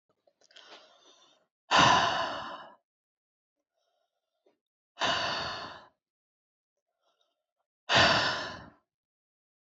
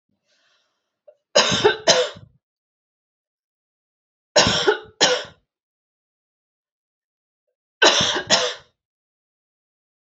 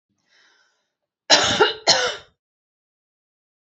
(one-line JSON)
{"exhalation_length": "9.7 s", "exhalation_amplitude": 13192, "exhalation_signal_mean_std_ratio": 0.34, "three_cough_length": "10.2 s", "three_cough_amplitude": 32186, "three_cough_signal_mean_std_ratio": 0.32, "cough_length": "3.7 s", "cough_amplitude": 31734, "cough_signal_mean_std_ratio": 0.33, "survey_phase": "beta (2021-08-13 to 2022-03-07)", "age": "45-64", "gender": "Female", "wearing_mask": "No", "symptom_none": true, "smoker_status": "Never smoked", "respiratory_condition_asthma": false, "respiratory_condition_other": false, "recruitment_source": "REACT", "submission_delay": "1 day", "covid_test_result": "Negative", "covid_test_method": "RT-qPCR", "influenza_a_test_result": "Negative", "influenza_b_test_result": "Negative"}